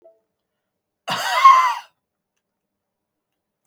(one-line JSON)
{"cough_length": "3.7 s", "cough_amplitude": 32055, "cough_signal_mean_std_ratio": 0.3, "survey_phase": "beta (2021-08-13 to 2022-03-07)", "age": "65+", "gender": "Male", "wearing_mask": "No", "symptom_none": true, "smoker_status": "Ex-smoker", "respiratory_condition_asthma": false, "respiratory_condition_other": false, "recruitment_source": "REACT", "submission_delay": "1 day", "covid_test_result": "Negative", "covid_test_method": "RT-qPCR", "influenza_a_test_result": "Negative", "influenza_b_test_result": "Negative"}